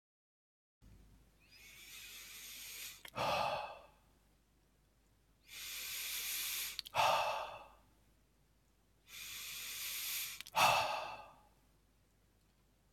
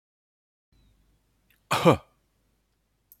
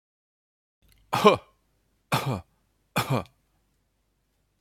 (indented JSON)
{
  "exhalation_length": "12.9 s",
  "exhalation_amplitude": 4132,
  "exhalation_signal_mean_std_ratio": 0.46,
  "cough_length": "3.2 s",
  "cough_amplitude": 22662,
  "cough_signal_mean_std_ratio": 0.2,
  "three_cough_length": "4.6 s",
  "three_cough_amplitude": 26005,
  "three_cough_signal_mean_std_ratio": 0.27,
  "survey_phase": "beta (2021-08-13 to 2022-03-07)",
  "age": "45-64",
  "gender": "Male",
  "wearing_mask": "No",
  "symptom_runny_or_blocked_nose": true,
  "symptom_onset": "3 days",
  "smoker_status": "Ex-smoker",
  "respiratory_condition_asthma": false,
  "respiratory_condition_other": false,
  "recruitment_source": "REACT",
  "submission_delay": "5 days",
  "covid_test_result": "Negative",
  "covid_test_method": "RT-qPCR"
}